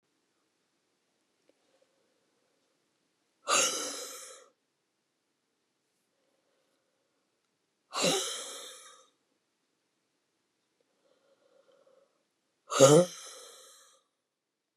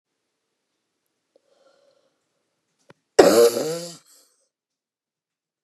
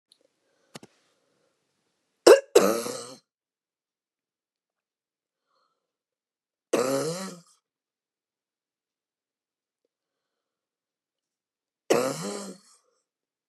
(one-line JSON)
{"exhalation_length": "14.8 s", "exhalation_amplitude": 16012, "exhalation_signal_mean_std_ratio": 0.21, "cough_length": "5.6 s", "cough_amplitude": 32768, "cough_signal_mean_std_ratio": 0.23, "three_cough_length": "13.5 s", "three_cough_amplitude": 29847, "three_cough_signal_mean_std_ratio": 0.2, "survey_phase": "beta (2021-08-13 to 2022-03-07)", "age": "65+", "gender": "Female", "wearing_mask": "No", "symptom_none": true, "smoker_status": "Never smoked", "respiratory_condition_asthma": true, "respiratory_condition_other": true, "recruitment_source": "REACT", "submission_delay": "0 days", "covid_test_result": "Negative", "covid_test_method": "RT-qPCR", "influenza_a_test_result": "Negative", "influenza_b_test_result": "Negative"}